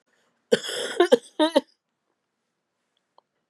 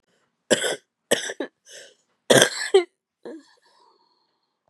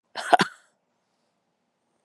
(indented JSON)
{
  "cough_length": "3.5 s",
  "cough_amplitude": 24761,
  "cough_signal_mean_std_ratio": 0.28,
  "three_cough_length": "4.7 s",
  "three_cough_amplitude": 32768,
  "three_cough_signal_mean_std_ratio": 0.29,
  "exhalation_length": "2.0 s",
  "exhalation_amplitude": 27245,
  "exhalation_signal_mean_std_ratio": 0.19,
  "survey_phase": "beta (2021-08-13 to 2022-03-07)",
  "age": "45-64",
  "gender": "Female",
  "wearing_mask": "No",
  "symptom_cough_any": true,
  "symptom_runny_or_blocked_nose": true,
  "symptom_shortness_of_breath": true,
  "symptom_sore_throat": true,
  "symptom_fatigue": true,
  "symptom_fever_high_temperature": true,
  "symptom_headache": true,
  "symptom_other": true,
  "symptom_onset": "3 days",
  "smoker_status": "Ex-smoker",
  "respiratory_condition_asthma": false,
  "respiratory_condition_other": false,
  "recruitment_source": "Test and Trace",
  "submission_delay": "1 day",
  "covid_test_result": "Positive",
  "covid_test_method": "RT-qPCR",
  "covid_ct_value": 23.3,
  "covid_ct_gene": "N gene"
}